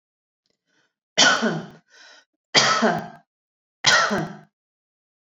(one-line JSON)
{"three_cough_length": "5.3 s", "three_cough_amplitude": 28792, "three_cough_signal_mean_std_ratio": 0.4, "survey_phase": "beta (2021-08-13 to 2022-03-07)", "age": "45-64", "gender": "Female", "wearing_mask": "No", "symptom_none": true, "smoker_status": "Never smoked", "respiratory_condition_asthma": false, "respiratory_condition_other": false, "recruitment_source": "REACT", "submission_delay": "5 days", "covid_test_result": "Negative", "covid_test_method": "RT-qPCR"}